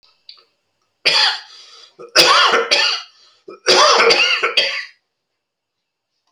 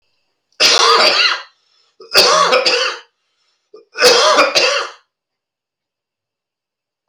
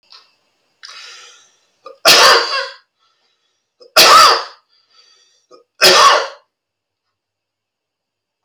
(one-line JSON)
{"cough_length": "6.3 s", "cough_amplitude": 32767, "cough_signal_mean_std_ratio": 0.5, "three_cough_length": "7.1 s", "three_cough_amplitude": 32768, "three_cough_signal_mean_std_ratio": 0.5, "exhalation_length": "8.4 s", "exhalation_amplitude": 32768, "exhalation_signal_mean_std_ratio": 0.35, "survey_phase": "alpha (2021-03-01 to 2021-08-12)", "age": "45-64", "gender": "Male", "wearing_mask": "No", "symptom_cough_any": true, "symptom_new_continuous_cough": true, "symptom_diarrhoea": true, "symptom_onset": "3 days", "smoker_status": "Never smoked", "respiratory_condition_asthma": false, "respiratory_condition_other": false, "recruitment_source": "Test and Trace", "submission_delay": "1 day", "covid_test_result": "Positive", "covid_test_method": "RT-qPCR"}